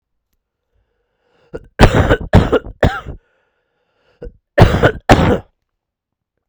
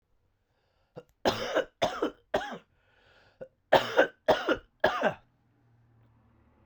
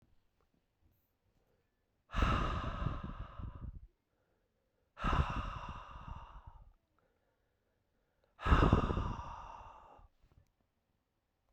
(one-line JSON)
{"cough_length": "6.5 s", "cough_amplitude": 32768, "cough_signal_mean_std_ratio": 0.36, "three_cough_length": "6.7 s", "three_cough_amplitude": 15872, "three_cough_signal_mean_std_ratio": 0.35, "exhalation_length": "11.5 s", "exhalation_amplitude": 8813, "exhalation_signal_mean_std_ratio": 0.37, "survey_phase": "beta (2021-08-13 to 2022-03-07)", "age": "18-44", "gender": "Male", "wearing_mask": "No", "symptom_cough_any": true, "symptom_fatigue": true, "symptom_fever_high_temperature": true, "symptom_headache": true, "symptom_onset": "2 days", "smoker_status": "Ex-smoker", "respiratory_condition_asthma": false, "respiratory_condition_other": false, "recruitment_source": "Test and Trace", "submission_delay": "0 days", "covid_test_result": "Positive", "covid_test_method": "RT-qPCR", "covid_ct_value": 19.4, "covid_ct_gene": "ORF1ab gene", "covid_ct_mean": 20.3, "covid_viral_load": "220000 copies/ml", "covid_viral_load_category": "Low viral load (10K-1M copies/ml)"}